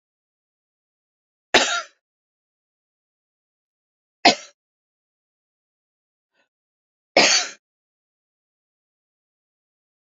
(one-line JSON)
{"three_cough_length": "10.1 s", "three_cough_amplitude": 30181, "three_cough_signal_mean_std_ratio": 0.18, "survey_phase": "alpha (2021-03-01 to 2021-08-12)", "age": "65+", "gender": "Female", "wearing_mask": "No", "symptom_shortness_of_breath": true, "symptom_fatigue": true, "symptom_change_to_sense_of_smell_or_taste": true, "symptom_onset": "12 days", "smoker_status": "Never smoked", "respiratory_condition_asthma": true, "respiratory_condition_other": false, "recruitment_source": "REACT", "submission_delay": "1 day", "covid_test_result": "Negative", "covid_test_method": "RT-qPCR"}